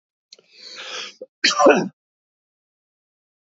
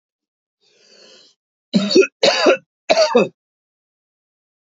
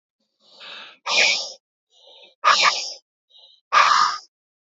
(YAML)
cough_length: 3.6 s
cough_amplitude: 28042
cough_signal_mean_std_ratio: 0.28
three_cough_length: 4.6 s
three_cough_amplitude: 27288
three_cough_signal_mean_std_ratio: 0.37
exhalation_length: 4.8 s
exhalation_amplitude: 26057
exhalation_signal_mean_std_ratio: 0.42
survey_phase: beta (2021-08-13 to 2022-03-07)
age: 45-64
gender: Male
wearing_mask: 'No'
symptom_none: true
smoker_status: Ex-smoker
respiratory_condition_asthma: false
respiratory_condition_other: false
recruitment_source: REACT
submission_delay: 2 days
covid_test_result: Negative
covid_test_method: RT-qPCR
influenza_a_test_result: Negative
influenza_b_test_result: Negative